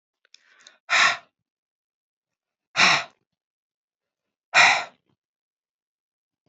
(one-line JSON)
{"exhalation_length": "6.5 s", "exhalation_amplitude": 25067, "exhalation_signal_mean_std_ratio": 0.27, "survey_phase": "beta (2021-08-13 to 2022-03-07)", "age": "45-64", "gender": "Female", "wearing_mask": "No", "symptom_cough_any": true, "symptom_new_continuous_cough": true, "symptom_runny_or_blocked_nose": true, "symptom_sore_throat": true, "symptom_headache": true, "symptom_change_to_sense_of_smell_or_taste": true, "symptom_loss_of_taste": true, "symptom_onset": "4 days", "smoker_status": "Never smoked", "respiratory_condition_asthma": false, "respiratory_condition_other": false, "recruitment_source": "Test and Trace", "submission_delay": "2 days", "covid_test_result": "Positive", "covid_test_method": "RT-qPCR"}